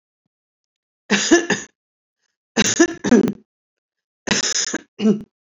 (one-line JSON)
{"three_cough_length": "5.5 s", "three_cough_amplitude": 29609, "three_cough_signal_mean_std_ratio": 0.4, "survey_phase": "beta (2021-08-13 to 2022-03-07)", "age": "45-64", "gender": "Female", "wearing_mask": "No", "symptom_abdominal_pain": true, "symptom_headache": true, "symptom_onset": "11 days", "smoker_status": "Current smoker (e-cigarettes or vapes only)", "respiratory_condition_asthma": false, "respiratory_condition_other": false, "recruitment_source": "REACT", "submission_delay": "1 day", "covid_test_result": "Negative", "covid_test_method": "RT-qPCR", "influenza_a_test_result": "Unknown/Void", "influenza_b_test_result": "Unknown/Void"}